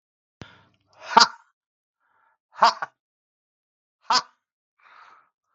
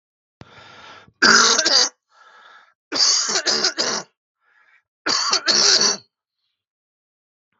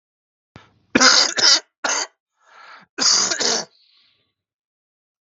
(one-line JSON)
{"exhalation_length": "5.5 s", "exhalation_amplitude": 32766, "exhalation_signal_mean_std_ratio": 0.19, "three_cough_length": "7.6 s", "three_cough_amplitude": 32768, "three_cough_signal_mean_std_ratio": 0.46, "cough_length": "5.2 s", "cough_amplitude": 32766, "cough_signal_mean_std_ratio": 0.4, "survey_phase": "beta (2021-08-13 to 2022-03-07)", "age": "45-64", "gender": "Male", "wearing_mask": "No", "symptom_cough_any": true, "smoker_status": "Never smoked", "respiratory_condition_asthma": false, "respiratory_condition_other": false, "recruitment_source": "REACT", "submission_delay": "6 days", "covid_test_result": "Negative", "covid_test_method": "RT-qPCR", "influenza_a_test_result": "Negative", "influenza_b_test_result": "Negative"}